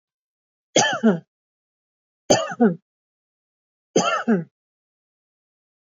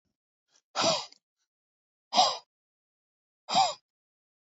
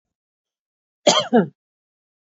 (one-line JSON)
{"three_cough_length": "5.8 s", "three_cough_amplitude": 25406, "three_cough_signal_mean_std_ratio": 0.34, "exhalation_length": "4.5 s", "exhalation_amplitude": 11413, "exhalation_signal_mean_std_ratio": 0.3, "cough_length": "2.4 s", "cough_amplitude": 29900, "cough_signal_mean_std_ratio": 0.27, "survey_phase": "alpha (2021-03-01 to 2021-08-12)", "age": "45-64", "gender": "Female", "wearing_mask": "No", "symptom_none": true, "smoker_status": "Ex-smoker", "respiratory_condition_asthma": false, "respiratory_condition_other": false, "recruitment_source": "REACT", "submission_delay": "2 days", "covid_test_result": "Negative", "covid_test_method": "RT-qPCR"}